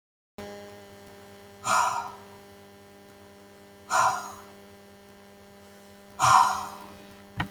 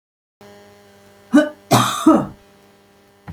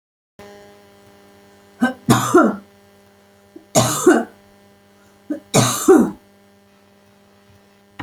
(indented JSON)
{
  "exhalation_length": "7.5 s",
  "exhalation_amplitude": 15610,
  "exhalation_signal_mean_std_ratio": 0.38,
  "cough_length": "3.3 s",
  "cough_amplitude": 31321,
  "cough_signal_mean_std_ratio": 0.36,
  "three_cough_length": "8.0 s",
  "three_cough_amplitude": 31422,
  "three_cough_signal_mean_std_ratio": 0.36,
  "survey_phase": "beta (2021-08-13 to 2022-03-07)",
  "age": "65+",
  "gender": "Female",
  "wearing_mask": "No",
  "symptom_none": true,
  "smoker_status": "Never smoked",
  "respiratory_condition_asthma": false,
  "respiratory_condition_other": false,
  "recruitment_source": "REACT",
  "submission_delay": "32 days",
  "covid_test_result": "Negative",
  "covid_test_method": "RT-qPCR",
  "influenza_a_test_result": "Unknown/Void",
  "influenza_b_test_result": "Unknown/Void"
}